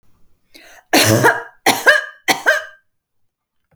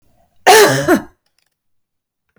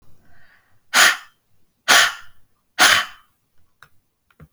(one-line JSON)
{"three_cough_length": "3.8 s", "three_cough_amplitude": 32767, "three_cough_signal_mean_std_ratio": 0.43, "cough_length": "2.4 s", "cough_amplitude": 32767, "cough_signal_mean_std_ratio": 0.38, "exhalation_length": "4.5 s", "exhalation_amplitude": 32768, "exhalation_signal_mean_std_ratio": 0.34, "survey_phase": "beta (2021-08-13 to 2022-03-07)", "age": "45-64", "gender": "Female", "wearing_mask": "No", "symptom_none": true, "smoker_status": "Never smoked", "respiratory_condition_asthma": false, "respiratory_condition_other": false, "recruitment_source": "REACT", "submission_delay": "4 days", "covid_test_result": "Negative", "covid_test_method": "RT-qPCR"}